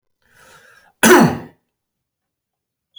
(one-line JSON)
{"cough_length": "3.0 s", "cough_amplitude": 32768, "cough_signal_mean_std_ratio": 0.27, "survey_phase": "beta (2021-08-13 to 2022-03-07)", "age": "18-44", "gender": "Male", "wearing_mask": "No", "symptom_none": true, "smoker_status": "Never smoked", "respiratory_condition_asthma": true, "respiratory_condition_other": false, "recruitment_source": "REACT", "submission_delay": "12 days", "covid_test_result": "Negative", "covid_test_method": "RT-qPCR"}